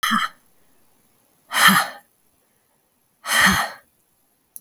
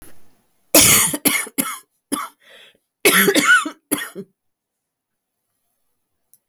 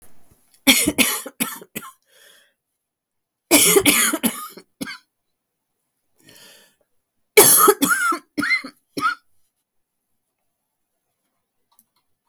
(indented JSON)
{
  "exhalation_length": "4.6 s",
  "exhalation_amplitude": 32768,
  "exhalation_signal_mean_std_ratio": 0.37,
  "cough_length": "6.5 s",
  "cough_amplitude": 32768,
  "cough_signal_mean_std_ratio": 0.39,
  "three_cough_length": "12.3 s",
  "three_cough_amplitude": 32766,
  "three_cough_signal_mean_std_ratio": 0.35,
  "survey_phase": "beta (2021-08-13 to 2022-03-07)",
  "age": "45-64",
  "gender": "Female",
  "wearing_mask": "No",
  "symptom_cough_any": true,
  "symptom_runny_or_blocked_nose": true,
  "symptom_sore_throat": true,
  "symptom_diarrhoea": true,
  "symptom_fatigue": true,
  "symptom_headache": true,
  "symptom_change_to_sense_of_smell_or_taste": true,
  "symptom_loss_of_taste": true,
  "symptom_other": true,
  "symptom_onset": "8 days",
  "smoker_status": "Never smoked",
  "respiratory_condition_asthma": false,
  "respiratory_condition_other": false,
  "recruitment_source": "Test and Trace",
  "submission_delay": "2 days",
  "covid_test_result": "Positive",
  "covid_test_method": "ePCR"
}